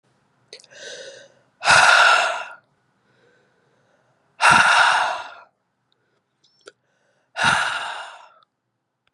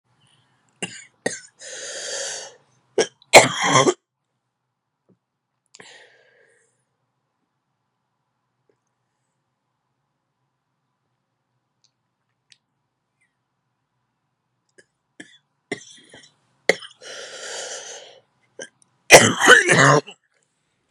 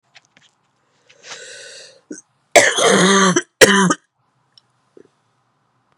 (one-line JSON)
{"exhalation_length": "9.1 s", "exhalation_amplitude": 28737, "exhalation_signal_mean_std_ratio": 0.39, "three_cough_length": "20.9 s", "three_cough_amplitude": 32768, "three_cough_signal_mean_std_ratio": 0.22, "cough_length": "6.0 s", "cough_amplitude": 32768, "cough_signal_mean_std_ratio": 0.36, "survey_phase": "beta (2021-08-13 to 2022-03-07)", "age": "18-44", "gender": "Female", "wearing_mask": "No", "symptom_cough_any": true, "symptom_runny_or_blocked_nose": true, "symptom_fatigue": true, "symptom_fever_high_temperature": true, "symptom_headache": true, "symptom_change_to_sense_of_smell_or_taste": true, "symptom_onset": "4 days", "smoker_status": "Ex-smoker", "respiratory_condition_asthma": false, "respiratory_condition_other": false, "recruitment_source": "Test and Trace", "submission_delay": "3 days", "covid_test_result": "Positive", "covid_test_method": "RT-qPCR", "covid_ct_value": 20.8, "covid_ct_gene": "ORF1ab gene", "covid_ct_mean": 21.0, "covid_viral_load": "130000 copies/ml", "covid_viral_load_category": "Low viral load (10K-1M copies/ml)"}